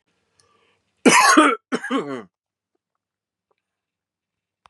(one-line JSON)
{"cough_length": "4.7 s", "cough_amplitude": 30493, "cough_signal_mean_std_ratio": 0.31, "survey_phase": "beta (2021-08-13 to 2022-03-07)", "age": "45-64", "gender": "Male", "wearing_mask": "No", "symptom_none": true, "smoker_status": "Never smoked", "respiratory_condition_asthma": false, "respiratory_condition_other": false, "recruitment_source": "REACT", "submission_delay": "1 day", "covid_test_result": "Negative", "covid_test_method": "RT-qPCR", "influenza_a_test_result": "Unknown/Void", "influenza_b_test_result": "Unknown/Void"}